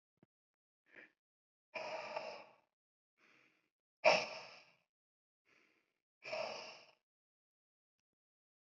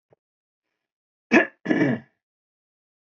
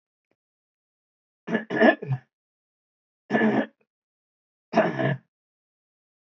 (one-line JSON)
{"exhalation_length": "8.6 s", "exhalation_amplitude": 5616, "exhalation_signal_mean_std_ratio": 0.23, "cough_length": "3.1 s", "cough_amplitude": 20666, "cough_signal_mean_std_ratio": 0.29, "three_cough_length": "6.3 s", "three_cough_amplitude": 19594, "three_cough_signal_mean_std_ratio": 0.33, "survey_phase": "beta (2021-08-13 to 2022-03-07)", "age": "45-64", "gender": "Male", "wearing_mask": "No", "symptom_none": true, "smoker_status": "Ex-smoker", "respiratory_condition_asthma": false, "respiratory_condition_other": false, "recruitment_source": "REACT", "submission_delay": "1 day", "covid_test_result": "Negative", "covid_test_method": "RT-qPCR"}